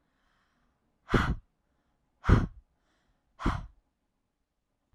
{
  "exhalation_length": "4.9 s",
  "exhalation_amplitude": 11466,
  "exhalation_signal_mean_std_ratio": 0.26,
  "survey_phase": "alpha (2021-03-01 to 2021-08-12)",
  "age": "18-44",
  "gender": "Female",
  "wearing_mask": "No",
  "symptom_fatigue": true,
  "symptom_headache": true,
  "smoker_status": "Never smoked",
  "respiratory_condition_asthma": false,
  "respiratory_condition_other": false,
  "recruitment_source": "REACT",
  "submission_delay": "2 days",
  "covid_test_result": "Negative",
  "covid_test_method": "RT-qPCR"
}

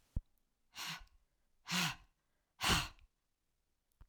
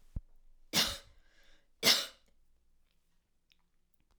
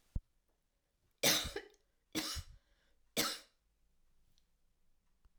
{
  "exhalation_length": "4.1 s",
  "exhalation_amplitude": 3161,
  "exhalation_signal_mean_std_ratio": 0.33,
  "cough_length": "4.2 s",
  "cough_amplitude": 9192,
  "cough_signal_mean_std_ratio": 0.27,
  "three_cough_length": "5.4 s",
  "three_cough_amplitude": 4777,
  "three_cough_signal_mean_std_ratio": 0.3,
  "survey_phase": "alpha (2021-03-01 to 2021-08-12)",
  "age": "65+",
  "gender": "Female",
  "wearing_mask": "No",
  "symptom_none": true,
  "smoker_status": "Ex-smoker",
  "respiratory_condition_asthma": false,
  "respiratory_condition_other": false,
  "recruitment_source": "REACT",
  "submission_delay": "2 days",
  "covid_test_result": "Negative",
  "covid_test_method": "RT-qPCR"
}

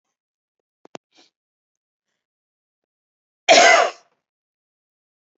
{
  "cough_length": "5.4 s",
  "cough_amplitude": 30849,
  "cough_signal_mean_std_ratio": 0.22,
  "survey_phase": "beta (2021-08-13 to 2022-03-07)",
  "age": "45-64",
  "gender": "Female",
  "wearing_mask": "No",
  "symptom_none": true,
  "smoker_status": "Never smoked",
  "respiratory_condition_asthma": false,
  "respiratory_condition_other": false,
  "recruitment_source": "Test and Trace",
  "submission_delay": "0 days",
  "covid_test_result": "Negative",
  "covid_test_method": "LFT"
}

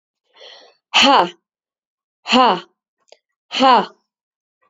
{
  "exhalation_length": "4.7 s",
  "exhalation_amplitude": 32767,
  "exhalation_signal_mean_std_ratio": 0.35,
  "survey_phase": "beta (2021-08-13 to 2022-03-07)",
  "age": "45-64",
  "gender": "Female",
  "wearing_mask": "No",
  "symptom_cough_any": true,
  "symptom_runny_or_blocked_nose": true,
  "symptom_headache": true,
  "symptom_onset": "6 days",
  "smoker_status": "Never smoked",
  "respiratory_condition_asthma": false,
  "respiratory_condition_other": false,
  "recruitment_source": "Test and Trace",
  "submission_delay": "2 days",
  "covid_test_result": "Positive",
  "covid_test_method": "RT-qPCR",
  "covid_ct_value": 24.2,
  "covid_ct_gene": "N gene"
}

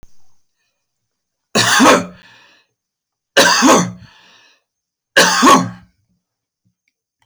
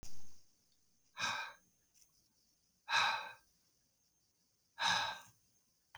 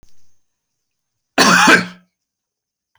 {
  "three_cough_length": "7.3 s",
  "three_cough_amplitude": 32768,
  "three_cough_signal_mean_std_ratio": 0.39,
  "exhalation_length": "6.0 s",
  "exhalation_amplitude": 3127,
  "exhalation_signal_mean_std_ratio": 0.42,
  "cough_length": "3.0 s",
  "cough_amplitude": 32283,
  "cough_signal_mean_std_ratio": 0.34,
  "survey_phase": "beta (2021-08-13 to 2022-03-07)",
  "age": "45-64",
  "gender": "Male",
  "wearing_mask": "No",
  "symptom_none": true,
  "smoker_status": "Never smoked",
  "respiratory_condition_asthma": false,
  "respiratory_condition_other": false,
  "recruitment_source": "REACT",
  "submission_delay": "1 day",
  "covid_test_result": "Negative",
  "covid_test_method": "RT-qPCR"
}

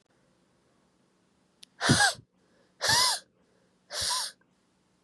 {
  "exhalation_length": "5.0 s",
  "exhalation_amplitude": 13252,
  "exhalation_signal_mean_std_ratio": 0.35,
  "survey_phase": "beta (2021-08-13 to 2022-03-07)",
  "age": "18-44",
  "gender": "Female",
  "wearing_mask": "No",
  "symptom_cough_any": true,
  "symptom_runny_or_blocked_nose": true,
  "symptom_abdominal_pain": true,
  "symptom_headache": true,
  "symptom_other": true,
  "smoker_status": "Never smoked",
  "respiratory_condition_asthma": true,
  "respiratory_condition_other": false,
  "recruitment_source": "Test and Trace",
  "submission_delay": "1 day",
  "covid_test_result": "Positive",
  "covid_test_method": "RT-qPCR",
  "covid_ct_value": 28.9,
  "covid_ct_gene": "ORF1ab gene",
  "covid_ct_mean": 29.8,
  "covid_viral_load": "170 copies/ml",
  "covid_viral_load_category": "Minimal viral load (< 10K copies/ml)"
}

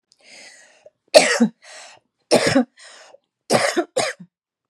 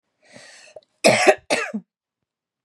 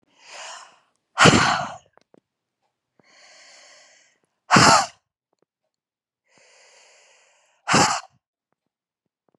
{
  "three_cough_length": "4.7 s",
  "three_cough_amplitude": 32768,
  "three_cough_signal_mean_std_ratio": 0.37,
  "cough_length": "2.6 s",
  "cough_amplitude": 32767,
  "cough_signal_mean_std_ratio": 0.33,
  "exhalation_length": "9.4 s",
  "exhalation_amplitude": 32544,
  "exhalation_signal_mean_std_ratio": 0.27,
  "survey_phase": "beta (2021-08-13 to 2022-03-07)",
  "age": "18-44",
  "gender": "Female",
  "wearing_mask": "No",
  "symptom_none": true,
  "symptom_onset": "6 days",
  "smoker_status": "Never smoked",
  "respiratory_condition_asthma": true,
  "respiratory_condition_other": false,
  "recruitment_source": "REACT",
  "submission_delay": "2 days",
  "covid_test_result": "Negative",
  "covid_test_method": "RT-qPCR",
  "influenza_a_test_result": "Negative",
  "influenza_b_test_result": "Negative"
}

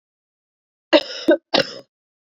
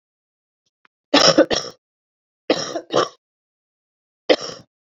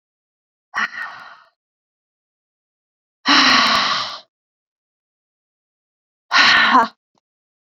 {
  "cough_length": "2.4 s",
  "cough_amplitude": 28522,
  "cough_signal_mean_std_ratio": 0.29,
  "three_cough_length": "4.9 s",
  "three_cough_amplitude": 32768,
  "three_cough_signal_mean_std_ratio": 0.3,
  "exhalation_length": "7.8 s",
  "exhalation_amplitude": 29542,
  "exhalation_signal_mean_std_ratio": 0.36,
  "survey_phase": "beta (2021-08-13 to 2022-03-07)",
  "age": "18-44",
  "gender": "Female",
  "wearing_mask": "No",
  "symptom_cough_any": true,
  "symptom_new_continuous_cough": true,
  "symptom_runny_or_blocked_nose": true,
  "symptom_shortness_of_breath": true,
  "symptom_sore_throat": true,
  "symptom_fatigue": true,
  "symptom_fever_high_temperature": true,
  "symptom_headache": true,
  "symptom_change_to_sense_of_smell_or_taste": true,
  "symptom_loss_of_taste": true,
  "symptom_other": true,
  "symptom_onset": "3 days",
  "smoker_status": "Never smoked",
  "respiratory_condition_asthma": false,
  "respiratory_condition_other": false,
  "recruitment_source": "Test and Trace",
  "submission_delay": "2 days",
  "covid_test_result": "Positive",
  "covid_test_method": "ePCR"
}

